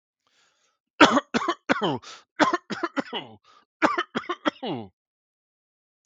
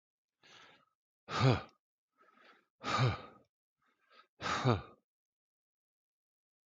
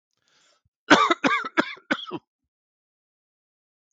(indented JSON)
{
  "three_cough_length": "6.1 s",
  "three_cough_amplitude": 32766,
  "three_cough_signal_mean_std_ratio": 0.34,
  "exhalation_length": "6.7 s",
  "exhalation_amplitude": 5781,
  "exhalation_signal_mean_std_ratio": 0.3,
  "cough_length": "3.9 s",
  "cough_amplitude": 32766,
  "cough_signal_mean_std_ratio": 0.29,
  "survey_phase": "beta (2021-08-13 to 2022-03-07)",
  "age": "65+",
  "gender": "Male",
  "wearing_mask": "No",
  "symptom_none": true,
  "smoker_status": "Never smoked",
  "respiratory_condition_asthma": false,
  "respiratory_condition_other": false,
  "recruitment_source": "REACT",
  "submission_delay": "1 day",
  "covid_test_result": "Negative",
  "covid_test_method": "RT-qPCR"
}